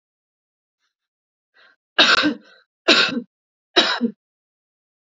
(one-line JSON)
{"three_cough_length": "5.1 s", "three_cough_amplitude": 32768, "three_cough_signal_mean_std_ratio": 0.33, "survey_phase": "alpha (2021-03-01 to 2021-08-12)", "age": "45-64", "gender": "Female", "wearing_mask": "No", "symptom_none": true, "smoker_status": "Ex-smoker", "respiratory_condition_asthma": true, "respiratory_condition_other": false, "recruitment_source": "REACT", "submission_delay": "8 days", "covid_test_result": "Negative", "covid_test_method": "RT-qPCR"}